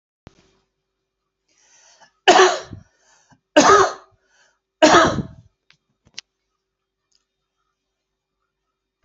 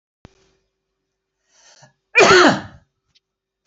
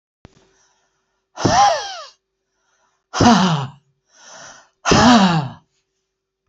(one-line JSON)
{"three_cough_length": "9.0 s", "three_cough_amplitude": 31544, "three_cough_signal_mean_std_ratio": 0.27, "cough_length": "3.7 s", "cough_amplitude": 32175, "cough_signal_mean_std_ratio": 0.29, "exhalation_length": "6.5 s", "exhalation_amplitude": 29315, "exhalation_signal_mean_std_ratio": 0.41, "survey_phase": "beta (2021-08-13 to 2022-03-07)", "age": "18-44", "gender": "Male", "wearing_mask": "No", "symptom_none": true, "smoker_status": "Never smoked", "respiratory_condition_asthma": false, "respiratory_condition_other": false, "recruitment_source": "REACT", "submission_delay": "2 days", "covid_test_result": "Negative", "covid_test_method": "RT-qPCR", "influenza_a_test_result": "Negative", "influenza_b_test_result": "Negative"}